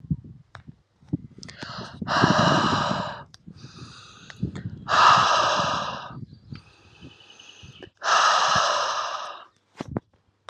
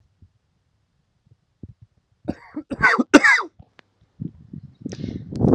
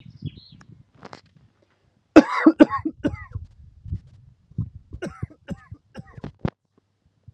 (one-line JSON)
{"exhalation_length": "10.5 s", "exhalation_amplitude": 21760, "exhalation_signal_mean_std_ratio": 0.53, "cough_length": "5.5 s", "cough_amplitude": 32768, "cough_signal_mean_std_ratio": 0.31, "three_cough_length": "7.3 s", "three_cough_amplitude": 32768, "three_cough_signal_mean_std_ratio": 0.23, "survey_phase": "alpha (2021-03-01 to 2021-08-12)", "age": "18-44", "gender": "Male", "wearing_mask": "No", "symptom_cough_any": true, "symptom_new_continuous_cough": true, "symptom_fatigue": true, "symptom_change_to_sense_of_smell_or_taste": true, "symptom_loss_of_taste": true, "smoker_status": "Never smoked", "respiratory_condition_asthma": false, "respiratory_condition_other": true, "recruitment_source": "Test and Trace", "submission_delay": "2 days", "covid_test_result": "Positive", "covid_test_method": "RT-qPCR", "covid_ct_value": 20.4, "covid_ct_gene": "ORF1ab gene", "covid_ct_mean": 20.8, "covid_viral_load": "150000 copies/ml", "covid_viral_load_category": "Low viral load (10K-1M copies/ml)"}